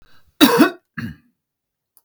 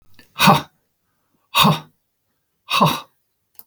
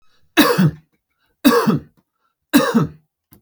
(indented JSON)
{
  "cough_length": "2.0 s",
  "cough_amplitude": 32768,
  "cough_signal_mean_std_ratio": 0.32,
  "exhalation_length": "3.7 s",
  "exhalation_amplitude": 32768,
  "exhalation_signal_mean_std_ratio": 0.35,
  "three_cough_length": "3.4 s",
  "three_cough_amplitude": 32768,
  "three_cough_signal_mean_std_ratio": 0.45,
  "survey_phase": "beta (2021-08-13 to 2022-03-07)",
  "age": "45-64",
  "gender": "Male",
  "wearing_mask": "No",
  "symptom_sore_throat": true,
  "smoker_status": "Never smoked",
  "respiratory_condition_asthma": false,
  "respiratory_condition_other": false,
  "recruitment_source": "Test and Trace",
  "submission_delay": "1 day",
  "covid_test_result": "Negative",
  "covid_test_method": "LFT"
}